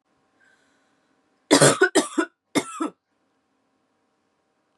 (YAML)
three_cough_length: 4.8 s
three_cough_amplitude: 28688
three_cough_signal_mean_std_ratio: 0.28
survey_phase: beta (2021-08-13 to 2022-03-07)
age: 18-44
gender: Female
wearing_mask: 'No'
symptom_cough_any: true
symptom_runny_or_blocked_nose: true
symptom_shortness_of_breath: true
symptom_sore_throat: true
symptom_fatigue: true
symptom_other: true
symptom_onset: 5 days
smoker_status: Never smoked
respiratory_condition_asthma: true
respiratory_condition_other: false
recruitment_source: Test and Trace
submission_delay: 1 day
covid_test_result: Positive
covid_test_method: RT-qPCR
covid_ct_value: 26.8
covid_ct_gene: N gene